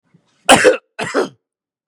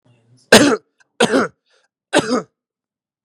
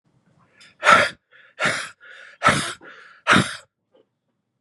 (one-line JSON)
{"cough_length": "1.9 s", "cough_amplitude": 32768, "cough_signal_mean_std_ratio": 0.37, "three_cough_length": "3.2 s", "three_cough_amplitude": 32768, "three_cough_signal_mean_std_ratio": 0.35, "exhalation_length": "4.6 s", "exhalation_amplitude": 32767, "exhalation_signal_mean_std_ratio": 0.35, "survey_phase": "beta (2021-08-13 to 2022-03-07)", "age": "18-44", "gender": "Male", "wearing_mask": "No", "symptom_cough_any": true, "symptom_runny_or_blocked_nose": true, "symptom_onset": "12 days", "smoker_status": "Ex-smoker", "respiratory_condition_asthma": false, "respiratory_condition_other": false, "recruitment_source": "REACT", "submission_delay": "0 days", "covid_test_result": "Negative", "covid_test_method": "RT-qPCR", "influenza_a_test_result": "Negative", "influenza_b_test_result": "Negative"}